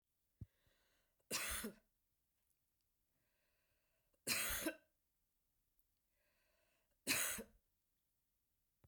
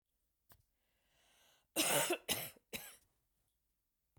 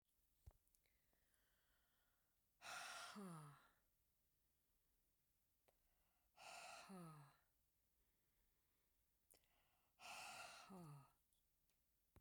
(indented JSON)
{
  "three_cough_length": "8.9 s",
  "three_cough_amplitude": 1983,
  "three_cough_signal_mean_std_ratio": 0.3,
  "cough_length": "4.2 s",
  "cough_amplitude": 3344,
  "cough_signal_mean_std_ratio": 0.32,
  "exhalation_length": "12.2 s",
  "exhalation_amplitude": 215,
  "exhalation_signal_mean_std_ratio": 0.48,
  "survey_phase": "beta (2021-08-13 to 2022-03-07)",
  "age": "45-64",
  "gender": "Female",
  "wearing_mask": "No",
  "symptom_cough_any": true,
  "symptom_runny_or_blocked_nose": true,
  "symptom_sore_throat": true,
  "symptom_other": true,
  "symptom_onset": "3 days",
  "smoker_status": "Never smoked",
  "respiratory_condition_asthma": false,
  "respiratory_condition_other": false,
  "recruitment_source": "Test and Trace",
  "submission_delay": "2 days",
  "covid_test_result": "Positive",
  "covid_test_method": "RT-qPCR",
  "covid_ct_value": 19.2,
  "covid_ct_gene": "N gene"
}